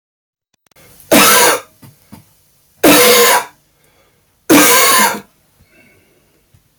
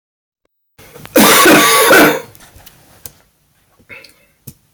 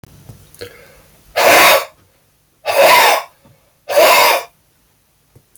{"three_cough_length": "6.8 s", "three_cough_amplitude": 32768, "three_cough_signal_mean_std_ratio": 0.46, "cough_length": "4.7 s", "cough_amplitude": 32768, "cough_signal_mean_std_ratio": 0.44, "exhalation_length": "5.6 s", "exhalation_amplitude": 31696, "exhalation_signal_mean_std_ratio": 0.47, "survey_phase": "beta (2021-08-13 to 2022-03-07)", "age": "45-64", "gender": "Male", "wearing_mask": "No", "symptom_none": true, "symptom_onset": "12 days", "smoker_status": "Current smoker (11 or more cigarettes per day)", "respiratory_condition_asthma": false, "respiratory_condition_other": false, "recruitment_source": "REACT", "submission_delay": "2 days", "covid_test_result": "Negative", "covid_test_method": "RT-qPCR", "influenza_a_test_result": "Negative", "influenza_b_test_result": "Negative"}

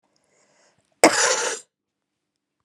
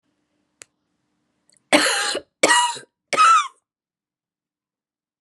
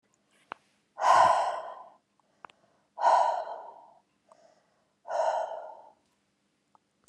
{"cough_length": "2.6 s", "cough_amplitude": 32768, "cough_signal_mean_std_ratio": 0.3, "three_cough_length": "5.2 s", "three_cough_amplitude": 31291, "three_cough_signal_mean_std_ratio": 0.36, "exhalation_length": "7.1 s", "exhalation_amplitude": 12224, "exhalation_signal_mean_std_ratio": 0.38, "survey_phase": "beta (2021-08-13 to 2022-03-07)", "age": "45-64", "gender": "Female", "wearing_mask": "No", "symptom_cough_any": true, "symptom_new_continuous_cough": true, "symptom_runny_or_blocked_nose": true, "symptom_fever_high_temperature": true, "symptom_headache": true, "symptom_change_to_sense_of_smell_or_taste": true, "symptom_loss_of_taste": true, "symptom_onset": "4 days", "smoker_status": "Never smoked", "respiratory_condition_asthma": false, "respiratory_condition_other": false, "recruitment_source": "Test and Trace", "submission_delay": "3 days", "covid_test_result": "Positive", "covid_test_method": "RT-qPCR", "covid_ct_value": 26.9, "covid_ct_gene": "ORF1ab gene", "covid_ct_mean": 27.7, "covid_viral_load": "830 copies/ml", "covid_viral_load_category": "Minimal viral load (< 10K copies/ml)"}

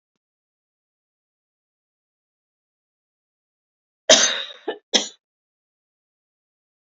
{"cough_length": "6.9 s", "cough_amplitude": 32412, "cough_signal_mean_std_ratio": 0.18, "survey_phase": "beta (2021-08-13 to 2022-03-07)", "age": "45-64", "gender": "Female", "wearing_mask": "No", "symptom_none": true, "smoker_status": "Never smoked", "respiratory_condition_asthma": false, "respiratory_condition_other": false, "recruitment_source": "REACT", "submission_delay": "1 day", "covid_test_result": "Negative", "covid_test_method": "RT-qPCR", "influenza_a_test_result": "Negative", "influenza_b_test_result": "Negative"}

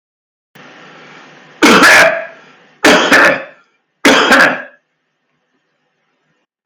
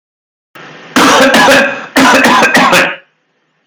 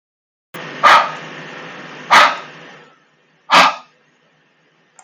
{"three_cough_length": "6.7 s", "three_cough_amplitude": 32768, "three_cough_signal_mean_std_ratio": 0.46, "cough_length": "3.7 s", "cough_amplitude": 32768, "cough_signal_mean_std_ratio": 0.76, "exhalation_length": "5.0 s", "exhalation_amplitude": 32768, "exhalation_signal_mean_std_ratio": 0.35, "survey_phase": "beta (2021-08-13 to 2022-03-07)", "age": "45-64", "gender": "Male", "wearing_mask": "No", "symptom_none": true, "smoker_status": "Never smoked", "respiratory_condition_asthma": false, "respiratory_condition_other": false, "recruitment_source": "REACT", "submission_delay": "2 days", "covid_test_result": "Negative", "covid_test_method": "RT-qPCR", "influenza_a_test_result": "Negative", "influenza_b_test_result": "Negative"}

